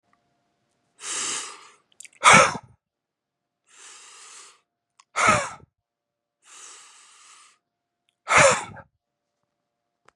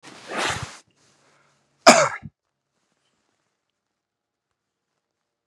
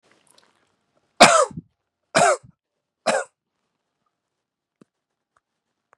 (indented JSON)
{
  "exhalation_length": "10.2 s",
  "exhalation_amplitude": 31054,
  "exhalation_signal_mean_std_ratio": 0.26,
  "cough_length": "5.5 s",
  "cough_amplitude": 32768,
  "cough_signal_mean_std_ratio": 0.2,
  "three_cough_length": "6.0 s",
  "three_cough_amplitude": 32768,
  "three_cough_signal_mean_std_ratio": 0.24,
  "survey_phase": "beta (2021-08-13 to 2022-03-07)",
  "age": "18-44",
  "gender": "Male",
  "wearing_mask": "No",
  "symptom_runny_or_blocked_nose": true,
  "symptom_onset": "12 days",
  "smoker_status": "Never smoked",
  "respiratory_condition_asthma": false,
  "respiratory_condition_other": false,
  "recruitment_source": "REACT",
  "submission_delay": "4 days",
  "covid_test_result": "Negative",
  "covid_test_method": "RT-qPCR",
  "influenza_a_test_result": "Unknown/Void",
  "influenza_b_test_result": "Unknown/Void"
}